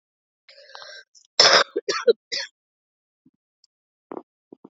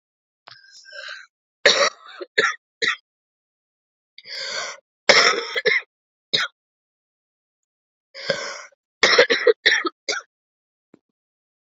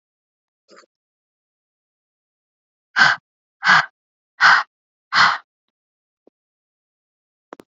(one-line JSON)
{"cough_length": "4.7 s", "cough_amplitude": 27409, "cough_signal_mean_std_ratio": 0.26, "three_cough_length": "11.8 s", "three_cough_amplitude": 30216, "three_cough_signal_mean_std_ratio": 0.34, "exhalation_length": "7.8 s", "exhalation_amplitude": 28715, "exhalation_signal_mean_std_ratio": 0.25, "survey_phase": "beta (2021-08-13 to 2022-03-07)", "age": "18-44", "gender": "Female", "wearing_mask": "No", "symptom_cough_any": true, "symptom_runny_or_blocked_nose": true, "symptom_sore_throat": true, "symptom_fatigue": true, "symptom_fever_high_temperature": true, "symptom_loss_of_taste": true, "symptom_onset": "6 days", "smoker_status": "Never smoked", "respiratory_condition_asthma": false, "respiratory_condition_other": false, "recruitment_source": "Test and Trace", "submission_delay": "4 days", "covid_test_result": "Positive", "covid_test_method": "RT-qPCR", "covid_ct_value": 17.3, "covid_ct_gene": "ORF1ab gene", "covid_ct_mean": 18.1, "covid_viral_load": "1200000 copies/ml", "covid_viral_load_category": "High viral load (>1M copies/ml)"}